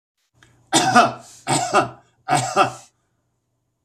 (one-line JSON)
{"three_cough_length": "3.8 s", "three_cough_amplitude": 30084, "three_cough_signal_mean_std_ratio": 0.44, "survey_phase": "beta (2021-08-13 to 2022-03-07)", "age": "45-64", "gender": "Male", "wearing_mask": "No", "symptom_none": true, "smoker_status": "Never smoked", "respiratory_condition_asthma": false, "respiratory_condition_other": false, "recruitment_source": "REACT", "submission_delay": "1 day", "covid_test_result": "Negative", "covid_test_method": "RT-qPCR", "influenza_a_test_result": "Negative", "influenza_b_test_result": "Negative"}